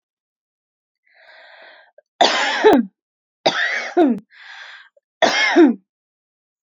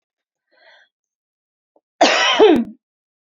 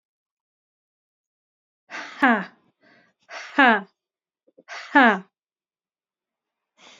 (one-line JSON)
{"three_cough_length": "6.7 s", "three_cough_amplitude": 31865, "three_cough_signal_mean_std_ratio": 0.41, "cough_length": "3.3 s", "cough_amplitude": 28489, "cough_signal_mean_std_ratio": 0.35, "exhalation_length": "7.0 s", "exhalation_amplitude": 27944, "exhalation_signal_mean_std_ratio": 0.24, "survey_phase": "alpha (2021-03-01 to 2021-08-12)", "age": "18-44", "gender": "Female", "wearing_mask": "No", "symptom_none": true, "symptom_onset": "5 days", "smoker_status": "Never smoked", "respiratory_condition_asthma": false, "respiratory_condition_other": false, "recruitment_source": "REACT", "submission_delay": "2 days", "covid_test_result": "Negative", "covid_test_method": "RT-qPCR"}